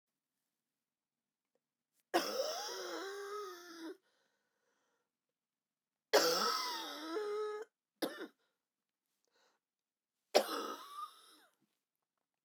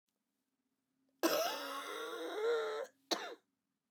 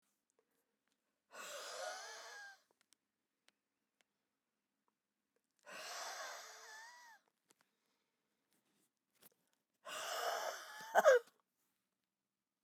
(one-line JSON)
{"three_cough_length": "12.4 s", "three_cough_amplitude": 7413, "three_cough_signal_mean_std_ratio": 0.37, "cough_length": "3.9 s", "cough_amplitude": 3467, "cough_signal_mean_std_ratio": 0.55, "exhalation_length": "12.6 s", "exhalation_amplitude": 5524, "exhalation_signal_mean_std_ratio": 0.25, "survey_phase": "beta (2021-08-13 to 2022-03-07)", "age": "45-64", "gender": "Female", "wearing_mask": "No", "symptom_cough_any": true, "symptom_runny_or_blocked_nose": true, "symptom_sore_throat": true, "symptom_fatigue": true, "symptom_fever_high_temperature": true, "symptom_headache": true, "smoker_status": "Ex-smoker", "respiratory_condition_asthma": false, "respiratory_condition_other": false, "recruitment_source": "Test and Trace", "submission_delay": "1 day", "covid_test_result": "Positive", "covid_test_method": "ePCR"}